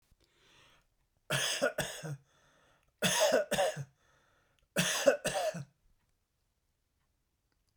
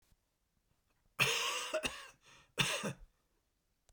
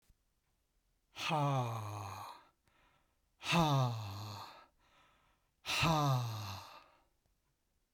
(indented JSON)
{
  "three_cough_length": "7.8 s",
  "three_cough_amplitude": 8455,
  "three_cough_signal_mean_std_ratio": 0.41,
  "cough_length": "3.9 s",
  "cough_amplitude": 5782,
  "cough_signal_mean_std_ratio": 0.42,
  "exhalation_length": "7.9 s",
  "exhalation_amplitude": 4283,
  "exhalation_signal_mean_std_ratio": 0.5,
  "survey_phase": "beta (2021-08-13 to 2022-03-07)",
  "age": "65+",
  "gender": "Male",
  "wearing_mask": "No",
  "symptom_none": true,
  "smoker_status": "Ex-smoker",
  "respiratory_condition_asthma": true,
  "respiratory_condition_other": false,
  "recruitment_source": "REACT",
  "submission_delay": "1 day",
  "covid_test_result": "Negative",
  "covid_test_method": "RT-qPCR",
  "influenza_a_test_result": "Unknown/Void",
  "influenza_b_test_result": "Unknown/Void"
}